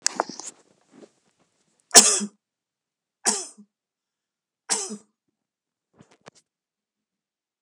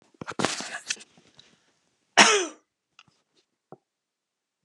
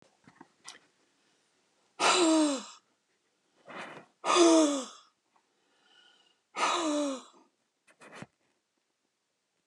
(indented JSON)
{
  "three_cough_length": "7.6 s",
  "three_cough_amplitude": 32768,
  "three_cough_signal_mean_std_ratio": 0.19,
  "cough_length": "4.6 s",
  "cough_amplitude": 27665,
  "cough_signal_mean_std_ratio": 0.24,
  "exhalation_length": "9.7 s",
  "exhalation_amplitude": 10862,
  "exhalation_signal_mean_std_ratio": 0.36,
  "survey_phase": "alpha (2021-03-01 to 2021-08-12)",
  "age": "65+",
  "gender": "Female",
  "wearing_mask": "No",
  "symptom_none": true,
  "smoker_status": "Ex-smoker",
  "respiratory_condition_asthma": false,
  "respiratory_condition_other": false,
  "recruitment_source": "REACT",
  "submission_delay": "2 days",
  "covid_test_result": "Negative",
  "covid_test_method": "RT-qPCR"
}